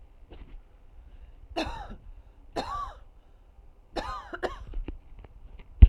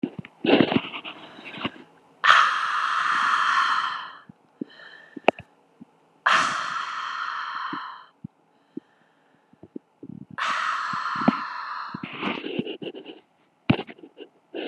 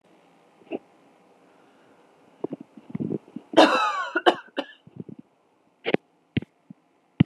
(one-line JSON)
{"three_cough_length": "5.9 s", "three_cough_amplitude": 32768, "three_cough_signal_mean_std_ratio": 0.23, "exhalation_length": "14.7 s", "exhalation_amplitude": 29256, "exhalation_signal_mean_std_ratio": 0.5, "cough_length": "7.3 s", "cough_amplitude": 29589, "cough_signal_mean_std_ratio": 0.27, "survey_phase": "alpha (2021-03-01 to 2021-08-12)", "age": "18-44", "gender": "Female", "wearing_mask": "No", "symptom_none": true, "smoker_status": "Ex-smoker", "respiratory_condition_asthma": true, "respiratory_condition_other": false, "recruitment_source": "REACT", "submission_delay": "2 days", "covid_test_result": "Negative", "covid_test_method": "RT-qPCR"}